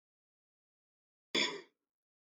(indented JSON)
{
  "cough_length": "2.4 s",
  "cough_amplitude": 3809,
  "cough_signal_mean_std_ratio": 0.23,
  "survey_phase": "beta (2021-08-13 to 2022-03-07)",
  "age": "45-64",
  "gender": "Male",
  "wearing_mask": "No",
  "symptom_cough_any": true,
  "symptom_runny_or_blocked_nose": true,
  "symptom_onset": "8 days",
  "smoker_status": "Never smoked",
  "respiratory_condition_asthma": false,
  "respiratory_condition_other": false,
  "recruitment_source": "REACT",
  "submission_delay": "1 day",
  "covid_test_result": "Negative",
  "covid_test_method": "RT-qPCR",
  "influenza_a_test_result": "Negative",
  "influenza_b_test_result": "Negative"
}